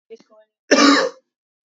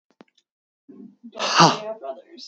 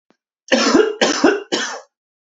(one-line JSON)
{"cough_length": "1.8 s", "cough_amplitude": 32143, "cough_signal_mean_std_ratio": 0.38, "exhalation_length": "2.5 s", "exhalation_amplitude": 29075, "exhalation_signal_mean_std_ratio": 0.34, "three_cough_length": "2.4 s", "three_cough_amplitude": 32252, "three_cough_signal_mean_std_ratio": 0.53, "survey_phase": "beta (2021-08-13 to 2022-03-07)", "age": "18-44", "gender": "Male", "wearing_mask": "No", "symptom_shortness_of_breath": true, "symptom_onset": "12 days", "smoker_status": "Ex-smoker", "respiratory_condition_asthma": true, "respiratory_condition_other": false, "recruitment_source": "REACT", "submission_delay": "0 days", "covid_test_result": "Negative", "covid_test_method": "RT-qPCR", "influenza_a_test_result": "Negative", "influenza_b_test_result": "Negative"}